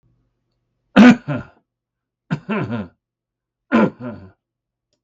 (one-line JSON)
{"three_cough_length": "5.0 s", "three_cough_amplitude": 32768, "three_cough_signal_mean_std_ratio": 0.29, "survey_phase": "beta (2021-08-13 to 2022-03-07)", "age": "65+", "gender": "Male", "wearing_mask": "No", "symptom_none": true, "smoker_status": "Ex-smoker", "respiratory_condition_asthma": false, "respiratory_condition_other": false, "recruitment_source": "REACT", "submission_delay": "2 days", "covid_test_result": "Negative", "covid_test_method": "RT-qPCR"}